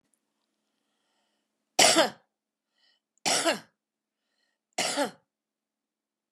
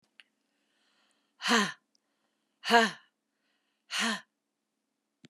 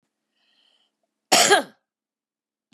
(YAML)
three_cough_length: 6.3 s
three_cough_amplitude: 22453
three_cough_signal_mean_std_ratio: 0.27
exhalation_length: 5.3 s
exhalation_amplitude: 15067
exhalation_signal_mean_std_ratio: 0.27
cough_length: 2.7 s
cough_amplitude: 25606
cough_signal_mean_std_ratio: 0.26
survey_phase: beta (2021-08-13 to 2022-03-07)
age: 65+
gender: Female
wearing_mask: 'No'
symptom_cough_any: true
symptom_onset: 6 days
smoker_status: Never smoked
respiratory_condition_asthma: false
respiratory_condition_other: false
recruitment_source: REACT
submission_delay: 1 day
covid_test_result: Negative
covid_test_method: RT-qPCR
influenza_a_test_result: Negative
influenza_b_test_result: Negative